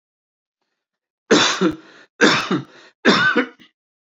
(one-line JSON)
{"three_cough_length": "4.2 s", "three_cough_amplitude": 28261, "three_cough_signal_mean_std_ratio": 0.43, "survey_phase": "beta (2021-08-13 to 2022-03-07)", "age": "65+", "gender": "Male", "wearing_mask": "No", "symptom_none": true, "smoker_status": "Ex-smoker", "respiratory_condition_asthma": false, "respiratory_condition_other": false, "recruitment_source": "REACT", "submission_delay": "2 days", "covid_test_result": "Negative", "covid_test_method": "RT-qPCR", "influenza_a_test_result": "Negative", "influenza_b_test_result": "Negative"}